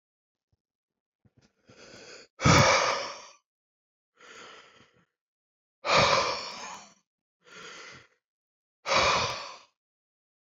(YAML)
exhalation_length: 10.6 s
exhalation_amplitude: 13498
exhalation_signal_mean_std_ratio: 0.34
survey_phase: beta (2021-08-13 to 2022-03-07)
age: 18-44
gender: Male
wearing_mask: 'No'
symptom_cough_any: true
symptom_runny_or_blocked_nose: true
smoker_status: Ex-smoker
respiratory_condition_asthma: true
respiratory_condition_other: false
recruitment_source: Test and Trace
submission_delay: 3 days
covid_test_result: Negative
covid_test_method: RT-qPCR